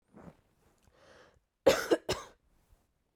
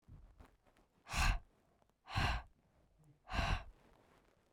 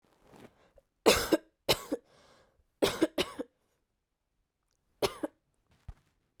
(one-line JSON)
{"cough_length": "3.2 s", "cough_amplitude": 9893, "cough_signal_mean_std_ratio": 0.25, "exhalation_length": "4.5 s", "exhalation_amplitude": 2641, "exhalation_signal_mean_std_ratio": 0.39, "three_cough_length": "6.4 s", "three_cough_amplitude": 14233, "three_cough_signal_mean_std_ratio": 0.27, "survey_phase": "beta (2021-08-13 to 2022-03-07)", "age": "18-44", "gender": "Female", "wearing_mask": "No", "symptom_none": true, "smoker_status": "Never smoked", "respiratory_condition_asthma": false, "respiratory_condition_other": false, "recruitment_source": "REACT", "submission_delay": "3 days", "covid_test_result": "Negative", "covid_test_method": "RT-qPCR"}